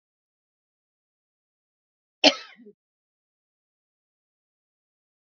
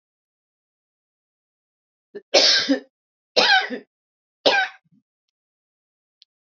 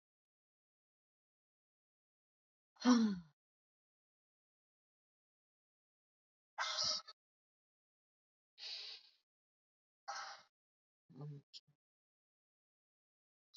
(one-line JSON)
{"cough_length": "5.4 s", "cough_amplitude": 26990, "cough_signal_mean_std_ratio": 0.1, "three_cough_length": "6.6 s", "three_cough_amplitude": 27330, "three_cough_signal_mean_std_ratio": 0.3, "exhalation_length": "13.6 s", "exhalation_amplitude": 3611, "exhalation_signal_mean_std_ratio": 0.21, "survey_phase": "beta (2021-08-13 to 2022-03-07)", "age": "45-64", "gender": "Female", "wearing_mask": "No", "symptom_none": true, "smoker_status": "Never smoked", "respiratory_condition_asthma": false, "respiratory_condition_other": false, "recruitment_source": "Test and Trace", "submission_delay": "0 days", "covid_test_result": "Negative", "covid_test_method": "LFT"}